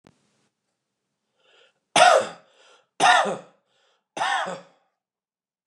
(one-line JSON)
{"three_cough_length": "5.7 s", "three_cough_amplitude": 27072, "three_cough_signal_mean_std_ratio": 0.31, "survey_phase": "beta (2021-08-13 to 2022-03-07)", "age": "45-64", "gender": "Male", "wearing_mask": "No", "symptom_runny_or_blocked_nose": true, "symptom_shortness_of_breath": true, "symptom_abdominal_pain": true, "symptom_diarrhoea": true, "symptom_fatigue": true, "symptom_fever_high_temperature": true, "symptom_headache": true, "symptom_onset": "2 days", "smoker_status": "Never smoked", "respiratory_condition_asthma": true, "respiratory_condition_other": false, "recruitment_source": "Test and Trace", "submission_delay": "1 day", "covid_test_result": "Positive", "covid_test_method": "ePCR"}